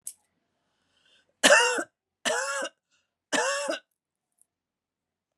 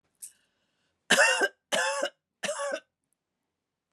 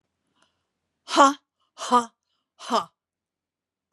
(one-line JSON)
{"three_cough_length": "5.4 s", "three_cough_amplitude": 20922, "three_cough_signal_mean_std_ratio": 0.34, "cough_length": "3.9 s", "cough_amplitude": 13394, "cough_signal_mean_std_ratio": 0.39, "exhalation_length": "3.9 s", "exhalation_amplitude": 22937, "exhalation_signal_mean_std_ratio": 0.26, "survey_phase": "beta (2021-08-13 to 2022-03-07)", "age": "65+", "gender": "Female", "wearing_mask": "No", "symptom_cough_any": true, "smoker_status": "Ex-smoker", "respiratory_condition_asthma": false, "respiratory_condition_other": true, "recruitment_source": "REACT", "submission_delay": "2 days", "covid_test_result": "Negative", "covid_test_method": "RT-qPCR", "influenza_a_test_result": "Negative", "influenza_b_test_result": "Negative"}